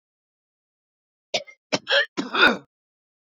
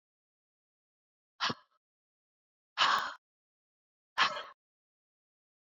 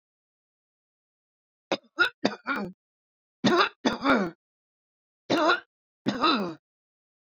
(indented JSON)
{
  "cough_length": "3.2 s",
  "cough_amplitude": 23403,
  "cough_signal_mean_std_ratio": 0.32,
  "exhalation_length": "5.7 s",
  "exhalation_amplitude": 7796,
  "exhalation_signal_mean_std_ratio": 0.25,
  "three_cough_length": "7.3 s",
  "three_cough_amplitude": 15484,
  "three_cough_signal_mean_std_ratio": 0.39,
  "survey_phase": "beta (2021-08-13 to 2022-03-07)",
  "age": "65+",
  "gender": "Female",
  "wearing_mask": "No",
  "symptom_none": true,
  "smoker_status": "Ex-smoker",
  "respiratory_condition_asthma": false,
  "respiratory_condition_other": true,
  "recruitment_source": "REACT",
  "submission_delay": "3 days",
  "covid_test_result": "Negative",
  "covid_test_method": "RT-qPCR"
}